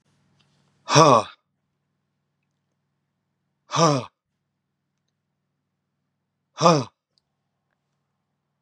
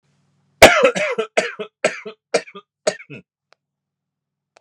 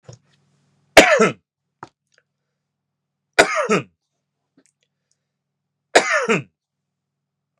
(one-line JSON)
{"exhalation_length": "8.6 s", "exhalation_amplitude": 32225, "exhalation_signal_mean_std_ratio": 0.22, "cough_length": "4.6 s", "cough_amplitude": 32768, "cough_signal_mean_std_ratio": 0.3, "three_cough_length": "7.6 s", "three_cough_amplitude": 32768, "three_cough_signal_mean_std_ratio": 0.27, "survey_phase": "beta (2021-08-13 to 2022-03-07)", "age": "45-64", "gender": "Male", "wearing_mask": "No", "symptom_none": true, "smoker_status": "Never smoked", "respiratory_condition_asthma": true, "respiratory_condition_other": false, "recruitment_source": "Test and Trace", "submission_delay": "1 day", "covid_test_result": "Negative", "covid_test_method": "RT-qPCR"}